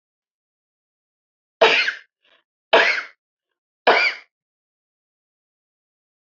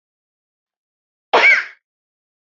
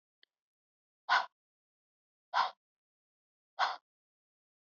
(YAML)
three_cough_length: 6.2 s
three_cough_amplitude: 29726
three_cough_signal_mean_std_ratio: 0.28
cough_length: 2.5 s
cough_amplitude: 26586
cough_signal_mean_std_ratio: 0.28
exhalation_length: 4.6 s
exhalation_amplitude: 4652
exhalation_signal_mean_std_ratio: 0.24
survey_phase: alpha (2021-03-01 to 2021-08-12)
age: 18-44
gender: Female
wearing_mask: 'No'
symptom_fatigue: true
smoker_status: Ex-smoker
respiratory_condition_asthma: false
respiratory_condition_other: false
recruitment_source: REACT
submission_delay: 2 days
covid_test_result: Negative
covid_test_method: RT-qPCR